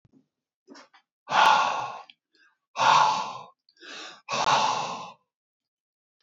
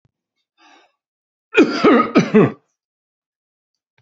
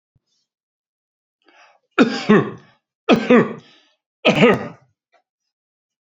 {
  "exhalation_length": "6.2 s",
  "exhalation_amplitude": 16209,
  "exhalation_signal_mean_std_ratio": 0.44,
  "cough_length": "4.0 s",
  "cough_amplitude": 32767,
  "cough_signal_mean_std_ratio": 0.34,
  "three_cough_length": "6.1 s",
  "three_cough_amplitude": 32767,
  "three_cough_signal_mean_std_ratio": 0.33,
  "survey_phase": "beta (2021-08-13 to 2022-03-07)",
  "age": "45-64",
  "gender": "Male",
  "wearing_mask": "No",
  "symptom_headache": true,
  "smoker_status": "Ex-smoker",
  "respiratory_condition_asthma": true,
  "respiratory_condition_other": false,
  "recruitment_source": "REACT",
  "submission_delay": "2 days",
  "covid_test_result": "Negative",
  "covid_test_method": "RT-qPCR",
  "influenza_a_test_result": "Negative",
  "influenza_b_test_result": "Negative"
}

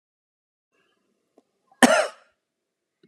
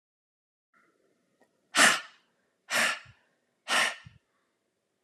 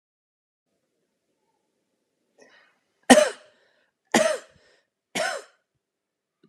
{
  "cough_length": "3.1 s",
  "cough_amplitude": 30309,
  "cough_signal_mean_std_ratio": 0.2,
  "exhalation_length": "5.0 s",
  "exhalation_amplitude": 15095,
  "exhalation_signal_mean_std_ratio": 0.29,
  "three_cough_length": "6.5 s",
  "three_cough_amplitude": 32767,
  "three_cough_signal_mean_std_ratio": 0.21,
  "survey_phase": "beta (2021-08-13 to 2022-03-07)",
  "age": "45-64",
  "gender": "Female",
  "wearing_mask": "No",
  "symptom_fatigue": true,
  "symptom_headache": true,
  "smoker_status": "Never smoked",
  "respiratory_condition_asthma": false,
  "respiratory_condition_other": false,
  "recruitment_source": "REACT",
  "submission_delay": "5 days",
  "covid_test_result": "Negative",
  "covid_test_method": "RT-qPCR"
}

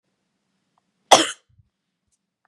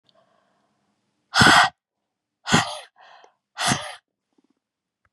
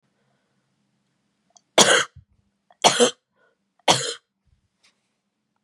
{
  "cough_length": "2.5 s",
  "cough_amplitude": 32768,
  "cough_signal_mean_std_ratio": 0.17,
  "exhalation_length": "5.1 s",
  "exhalation_amplitude": 27854,
  "exhalation_signal_mean_std_ratio": 0.3,
  "three_cough_length": "5.6 s",
  "three_cough_amplitude": 32767,
  "three_cough_signal_mean_std_ratio": 0.26,
  "survey_phase": "beta (2021-08-13 to 2022-03-07)",
  "age": "45-64",
  "gender": "Female",
  "wearing_mask": "No",
  "symptom_runny_or_blocked_nose": true,
  "smoker_status": "Ex-smoker",
  "respiratory_condition_asthma": false,
  "respiratory_condition_other": false,
  "recruitment_source": "Test and Trace",
  "submission_delay": "2 days",
  "covid_test_result": "Positive",
  "covid_test_method": "RT-qPCR",
  "covid_ct_value": 26.1,
  "covid_ct_gene": "N gene"
}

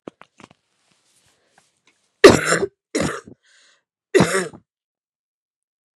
{
  "three_cough_length": "6.0 s",
  "three_cough_amplitude": 32768,
  "three_cough_signal_mean_std_ratio": 0.24,
  "survey_phase": "beta (2021-08-13 to 2022-03-07)",
  "age": "18-44",
  "gender": "Female",
  "wearing_mask": "No",
  "symptom_new_continuous_cough": true,
  "symptom_shortness_of_breath": true,
  "symptom_diarrhoea": true,
  "symptom_fatigue": true,
  "symptom_headache": true,
  "symptom_change_to_sense_of_smell_or_taste": true,
  "symptom_loss_of_taste": true,
  "smoker_status": "Ex-smoker",
  "respiratory_condition_asthma": false,
  "respiratory_condition_other": false,
  "recruitment_source": "Test and Trace",
  "submission_delay": "4 days",
  "covid_test_result": "Positive",
  "covid_test_method": "LFT"
}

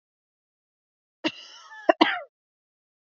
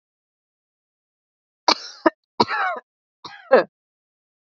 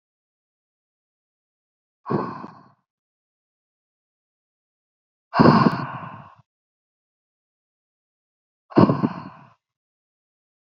{
  "cough_length": "3.2 s",
  "cough_amplitude": 25902,
  "cough_signal_mean_std_ratio": 0.2,
  "three_cough_length": "4.5 s",
  "three_cough_amplitude": 28766,
  "three_cough_signal_mean_std_ratio": 0.25,
  "exhalation_length": "10.7 s",
  "exhalation_amplitude": 27293,
  "exhalation_signal_mean_std_ratio": 0.23,
  "survey_phase": "beta (2021-08-13 to 2022-03-07)",
  "age": "18-44",
  "gender": "Female",
  "wearing_mask": "No",
  "symptom_shortness_of_breath": true,
  "symptom_sore_throat": true,
  "symptom_diarrhoea": true,
  "symptom_fatigue": true,
  "symptom_onset": "2 days",
  "smoker_status": "Never smoked",
  "respiratory_condition_asthma": false,
  "respiratory_condition_other": false,
  "recruitment_source": "Test and Trace",
  "submission_delay": "1 day",
  "covid_test_result": "Positive",
  "covid_test_method": "RT-qPCR",
  "covid_ct_value": 21.1,
  "covid_ct_gene": "ORF1ab gene",
  "covid_ct_mean": 21.8,
  "covid_viral_load": "70000 copies/ml",
  "covid_viral_load_category": "Low viral load (10K-1M copies/ml)"
}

